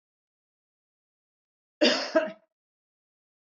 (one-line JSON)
{"cough_length": "3.6 s", "cough_amplitude": 14429, "cough_signal_mean_std_ratio": 0.25, "survey_phase": "beta (2021-08-13 to 2022-03-07)", "age": "45-64", "gender": "Female", "wearing_mask": "No", "symptom_none": true, "smoker_status": "Never smoked", "respiratory_condition_asthma": false, "respiratory_condition_other": false, "recruitment_source": "REACT", "submission_delay": "2 days", "covid_test_result": "Negative", "covid_test_method": "RT-qPCR", "influenza_a_test_result": "Negative", "influenza_b_test_result": "Negative"}